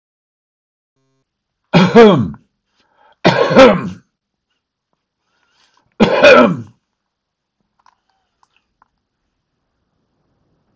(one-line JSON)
{"cough_length": "10.8 s", "cough_amplitude": 32768, "cough_signal_mean_std_ratio": 0.31, "survey_phase": "beta (2021-08-13 to 2022-03-07)", "age": "65+", "gender": "Male", "wearing_mask": "No", "symptom_none": true, "smoker_status": "Ex-smoker", "respiratory_condition_asthma": false, "respiratory_condition_other": false, "recruitment_source": "REACT", "submission_delay": "4 days", "covid_test_result": "Negative", "covid_test_method": "RT-qPCR", "influenza_a_test_result": "Unknown/Void", "influenza_b_test_result": "Unknown/Void"}